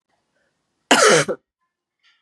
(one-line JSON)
{"cough_length": "2.2 s", "cough_amplitude": 32224, "cough_signal_mean_std_ratio": 0.33, "survey_phase": "beta (2021-08-13 to 2022-03-07)", "age": "18-44", "gender": "Female", "wearing_mask": "No", "symptom_runny_or_blocked_nose": true, "symptom_headache": true, "symptom_onset": "5 days", "smoker_status": "Ex-smoker", "respiratory_condition_asthma": false, "respiratory_condition_other": false, "recruitment_source": "Test and Trace", "submission_delay": "3 days", "covid_test_method": "RT-qPCR", "covid_ct_value": 31.5, "covid_ct_gene": "ORF1ab gene", "covid_ct_mean": 33.0, "covid_viral_load": "15 copies/ml", "covid_viral_load_category": "Minimal viral load (< 10K copies/ml)"}